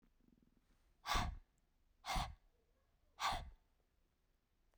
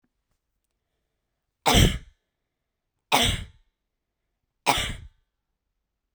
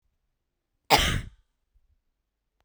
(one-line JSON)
{"exhalation_length": "4.8 s", "exhalation_amplitude": 1967, "exhalation_signal_mean_std_ratio": 0.35, "three_cough_length": "6.1 s", "three_cough_amplitude": 21034, "three_cough_signal_mean_std_ratio": 0.28, "cough_length": "2.6 s", "cough_amplitude": 23106, "cough_signal_mean_std_ratio": 0.25, "survey_phase": "beta (2021-08-13 to 2022-03-07)", "age": "18-44", "gender": "Female", "wearing_mask": "No", "symptom_sore_throat": true, "smoker_status": "Never smoked", "respiratory_condition_asthma": false, "respiratory_condition_other": false, "recruitment_source": "REACT", "submission_delay": "2 days", "covid_test_result": "Negative", "covid_test_method": "RT-qPCR"}